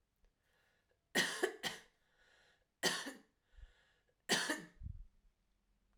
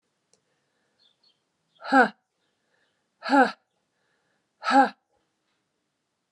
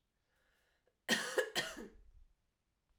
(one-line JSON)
{"three_cough_length": "6.0 s", "three_cough_amplitude": 3784, "three_cough_signal_mean_std_ratio": 0.35, "exhalation_length": "6.3 s", "exhalation_amplitude": 18968, "exhalation_signal_mean_std_ratio": 0.24, "cough_length": "3.0 s", "cough_amplitude": 3455, "cough_signal_mean_std_ratio": 0.34, "survey_phase": "alpha (2021-03-01 to 2021-08-12)", "age": "45-64", "gender": "Female", "wearing_mask": "No", "symptom_cough_any": true, "symptom_abdominal_pain": true, "symptom_fatigue": true, "symptom_fever_high_temperature": true, "symptom_headache": true, "symptom_change_to_sense_of_smell_or_taste": true, "symptom_onset": "3 days", "smoker_status": "Never smoked", "respiratory_condition_asthma": false, "respiratory_condition_other": false, "recruitment_source": "Test and Trace", "submission_delay": "1 day", "covid_test_result": "Positive", "covid_test_method": "RT-qPCR", "covid_ct_value": 17.7, "covid_ct_gene": "ORF1ab gene", "covid_ct_mean": 18.2, "covid_viral_load": "1100000 copies/ml", "covid_viral_load_category": "High viral load (>1M copies/ml)"}